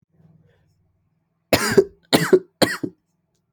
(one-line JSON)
{"three_cough_length": "3.5 s", "three_cough_amplitude": 32276, "three_cough_signal_mean_std_ratio": 0.31, "survey_phase": "alpha (2021-03-01 to 2021-08-12)", "age": "18-44", "gender": "Male", "wearing_mask": "No", "symptom_cough_any": true, "symptom_new_continuous_cough": true, "symptom_fever_high_temperature": true, "symptom_change_to_sense_of_smell_or_taste": true, "smoker_status": "Never smoked", "respiratory_condition_asthma": false, "respiratory_condition_other": false, "recruitment_source": "Test and Trace", "submission_delay": "2 days", "covid_test_result": "Positive", "covid_test_method": "RT-qPCR", "covid_ct_value": 18.4, "covid_ct_gene": "ORF1ab gene"}